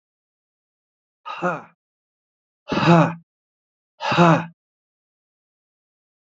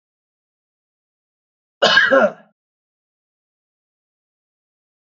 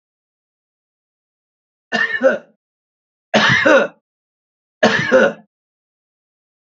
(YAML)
exhalation_length: 6.3 s
exhalation_amplitude: 28646
exhalation_signal_mean_std_ratio: 0.29
cough_length: 5.0 s
cough_amplitude: 27196
cough_signal_mean_std_ratio: 0.24
three_cough_length: 6.7 s
three_cough_amplitude: 32768
three_cough_signal_mean_std_ratio: 0.36
survey_phase: alpha (2021-03-01 to 2021-08-12)
age: 45-64
gender: Male
wearing_mask: 'No'
symptom_none: true
smoker_status: Ex-smoker
respiratory_condition_asthma: false
respiratory_condition_other: false
recruitment_source: REACT
submission_delay: 2 days
covid_test_result: Negative
covid_test_method: RT-qPCR